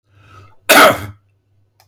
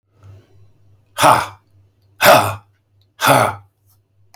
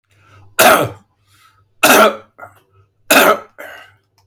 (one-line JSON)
{"cough_length": "1.9 s", "cough_amplitude": 32768, "cough_signal_mean_std_ratio": 0.35, "exhalation_length": "4.4 s", "exhalation_amplitude": 32768, "exhalation_signal_mean_std_ratio": 0.36, "three_cough_length": "4.3 s", "three_cough_amplitude": 32768, "three_cough_signal_mean_std_ratio": 0.39, "survey_phase": "beta (2021-08-13 to 2022-03-07)", "age": "65+", "gender": "Male", "wearing_mask": "No", "symptom_none": true, "smoker_status": "Never smoked", "respiratory_condition_asthma": false, "respiratory_condition_other": false, "recruitment_source": "REACT", "submission_delay": "2 days", "covid_test_result": "Negative", "covid_test_method": "RT-qPCR", "influenza_a_test_result": "Negative", "influenza_b_test_result": "Negative"}